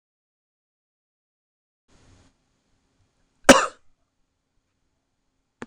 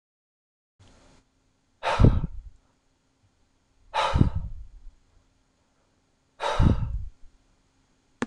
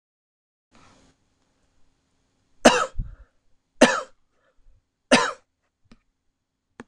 cough_length: 5.7 s
cough_amplitude: 26028
cough_signal_mean_std_ratio: 0.12
exhalation_length: 8.3 s
exhalation_amplitude: 22001
exhalation_signal_mean_std_ratio: 0.32
three_cough_length: 6.9 s
three_cough_amplitude: 26028
three_cough_signal_mean_std_ratio: 0.22
survey_phase: beta (2021-08-13 to 2022-03-07)
age: 18-44
gender: Male
wearing_mask: 'No'
symptom_none: true
smoker_status: Never smoked
respiratory_condition_asthma: false
respiratory_condition_other: false
recruitment_source: Test and Trace
submission_delay: 1 day
covid_test_result: Negative
covid_test_method: LFT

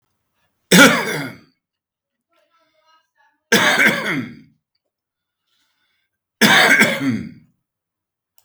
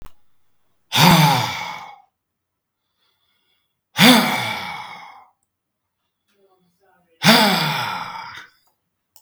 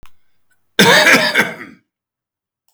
three_cough_length: 8.4 s
three_cough_amplitude: 32768
three_cough_signal_mean_std_ratio: 0.37
exhalation_length: 9.2 s
exhalation_amplitude: 32768
exhalation_signal_mean_std_ratio: 0.38
cough_length: 2.7 s
cough_amplitude: 32766
cough_signal_mean_std_ratio: 0.43
survey_phase: beta (2021-08-13 to 2022-03-07)
age: 45-64
gender: Male
wearing_mask: 'No'
symptom_none: true
smoker_status: Current smoker (e-cigarettes or vapes only)
respiratory_condition_asthma: false
respiratory_condition_other: false
recruitment_source: REACT
submission_delay: 3 days
covid_test_result: Negative
covid_test_method: RT-qPCR
influenza_a_test_result: Negative
influenza_b_test_result: Negative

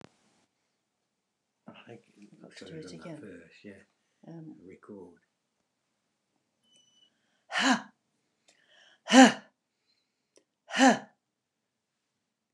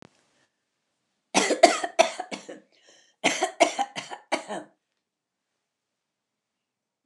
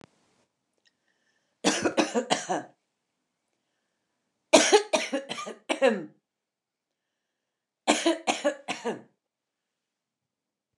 exhalation_length: 12.5 s
exhalation_amplitude: 24879
exhalation_signal_mean_std_ratio: 0.19
cough_length: 7.1 s
cough_amplitude: 28971
cough_signal_mean_std_ratio: 0.28
three_cough_length: 10.8 s
three_cough_amplitude: 21735
three_cough_signal_mean_std_ratio: 0.33
survey_phase: beta (2021-08-13 to 2022-03-07)
age: 65+
gender: Female
wearing_mask: 'No'
symptom_none: true
smoker_status: Never smoked
respiratory_condition_asthma: false
respiratory_condition_other: false
recruitment_source: REACT
submission_delay: 3 days
covid_test_result: Negative
covid_test_method: RT-qPCR
influenza_a_test_result: Negative
influenza_b_test_result: Negative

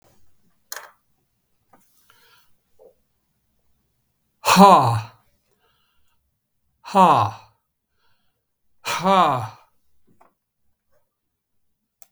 exhalation_length: 12.1 s
exhalation_amplitude: 32768
exhalation_signal_mean_std_ratio: 0.26
survey_phase: beta (2021-08-13 to 2022-03-07)
age: 65+
gender: Male
wearing_mask: 'No'
symptom_none: true
smoker_status: Never smoked
respiratory_condition_asthma: false
respiratory_condition_other: false
recruitment_source: REACT
submission_delay: 3 days
covid_test_result: Negative
covid_test_method: RT-qPCR
influenza_a_test_result: Negative
influenza_b_test_result: Negative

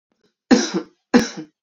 three_cough_length: 1.6 s
three_cough_amplitude: 29494
three_cough_signal_mean_std_ratio: 0.37
survey_phase: beta (2021-08-13 to 2022-03-07)
age: 18-44
gender: Female
wearing_mask: 'No'
symptom_cough_any: true
symptom_runny_or_blocked_nose: true
symptom_change_to_sense_of_smell_or_taste: true
symptom_onset: 5 days
smoker_status: Never smoked
respiratory_condition_asthma: false
respiratory_condition_other: false
recruitment_source: Test and Trace
submission_delay: 2 days
covid_test_result: Positive
covid_test_method: ePCR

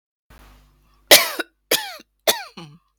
three_cough_length: 3.0 s
three_cough_amplitude: 32768
three_cough_signal_mean_std_ratio: 0.27
survey_phase: beta (2021-08-13 to 2022-03-07)
age: 45-64
gender: Female
wearing_mask: 'No'
symptom_sore_throat: true
symptom_onset: 2 days
smoker_status: Never smoked
respiratory_condition_asthma: false
respiratory_condition_other: false
recruitment_source: Test and Trace
submission_delay: 1 day
covid_test_result: Negative
covid_test_method: ePCR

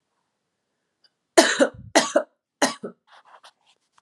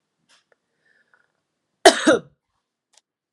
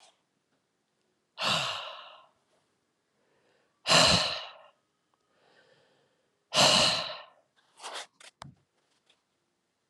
three_cough_length: 4.0 s
three_cough_amplitude: 32742
three_cough_signal_mean_std_ratio: 0.28
cough_length: 3.3 s
cough_amplitude: 32768
cough_signal_mean_std_ratio: 0.2
exhalation_length: 9.9 s
exhalation_amplitude: 15133
exhalation_signal_mean_std_ratio: 0.31
survey_phase: beta (2021-08-13 to 2022-03-07)
age: 18-44
gender: Female
wearing_mask: 'No'
symptom_sore_throat: true
symptom_fatigue: true
symptom_fever_high_temperature: true
symptom_headache: true
smoker_status: Never smoked
respiratory_condition_asthma: false
respiratory_condition_other: false
recruitment_source: Test and Trace
submission_delay: 2 days
covid_test_result: Positive
covid_test_method: RT-qPCR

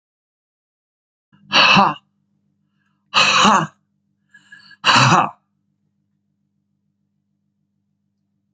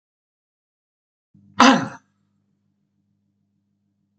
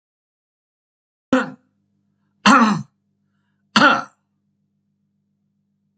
exhalation_length: 8.5 s
exhalation_amplitude: 32564
exhalation_signal_mean_std_ratio: 0.32
cough_length: 4.2 s
cough_amplitude: 32768
cough_signal_mean_std_ratio: 0.19
three_cough_length: 6.0 s
three_cough_amplitude: 30419
three_cough_signal_mean_std_ratio: 0.27
survey_phase: beta (2021-08-13 to 2022-03-07)
age: 65+
gender: Male
wearing_mask: 'No'
symptom_cough_any: true
smoker_status: Ex-smoker
respiratory_condition_asthma: false
respiratory_condition_other: false
recruitment_source: Test and Trace
submission_delay: 1 day
covid_test_result: Negative
covid_test_method: ePCR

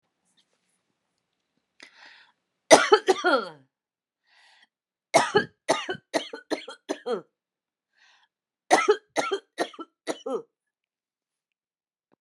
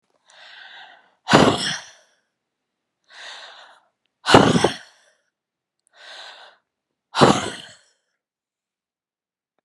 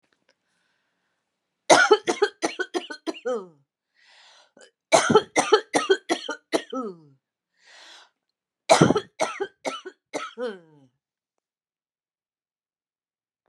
three_cough_length: 12.2 s
three_cough_amplitude: 32767
three_cough_signal_mean_std_ratio: 0.27
exhalation_length: 9.6 s
exhalation_amplitude: 32768
exhalation_signal_mean_std_ratio: 0.27
cough_length: 13.5 s
cough_amplitude: 29270
cough_signal_mean_std_ratio: 0.31
survey_phase: alpha (2021-03-01 to 2021-08-12)
age: 45-64
gender: Female
wearing_mask: 'No'
symptom_none: true
smoker_status: Never smoked
respiratory_condition_asthma: false
respiratory_condition_other: false
recruitment_source: REACT
submission_delay: 2 days
covid_test_result: Negative
covid_test_method: RT-qPCR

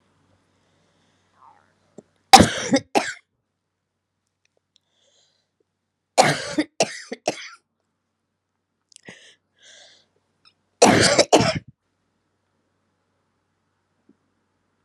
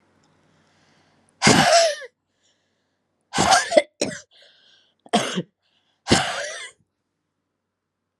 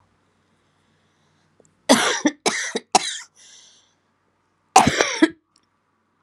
three_cough_length: 14.8 s
three_cough_amplitude: 32768
three_cough_signal_mean_std_ratio: 0.23
exhalation_length: 8.2 s
exhalation_amplitude: 30674
exhalation_signal_mean_std_ratio: 0.35
cough_length: 6.2 s
cough_amplitude: 32767
cough_signal_mean_std_ratio: 0.31
survey_phase: beta (2021-08-13 to 2022-03-07)
age: 45-64
gender: Female
wearing_mask: 'No'
symptom_cough_any: true
symptom_runny_or_blocked_nose: true
symptom_shortness_of_breath: true
symptom_sore_throat: true
symptom_fatigue: true
symptom_headache: true
smoker_status: Current smoker (11 or more cigarettes per day)
respiratory_condition_asthma: false
respiratory_condition_other: false
recruitment_source: Test and Trace
submission_delay: 1 day
covid_test_result: Positive
covid_test_method: LFT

